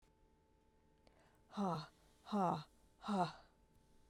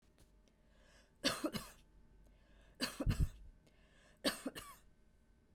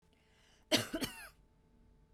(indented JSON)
{
  "exhalation_length": "4.1 s",
  "exhalation_amplitude": 1989,
  "exhalation_signal_mean_std_ratio": 0.41,
  "three_cough_length": "5.5 s",
  "three_cough_amplitude": 3126,
  "three_cough_signal_mean_std_ratio": 0.36,
  "cough_length": "2.1 s",
  "cough_amplitude": 5857,
  "cough_signal_mean_std_ratio": 0.31,
  "survey_phase": "beta (2021-08-13 to 2022-03-07)",
  "age": "45-64",
  "gender": "Female",
  "wearing_mask": "No",
  "symptom_fatigue": true,
  "smoker_status": "Never smoked",
  "respiratory_condition_asthma": false,
  "respiratory_condition_other": false,
  "recruitment_source": "REACT",
  "submission_delay": "1 day",
  "covid_test_result": "Negative",
  "covid_test_method": "RT-qPCR"
}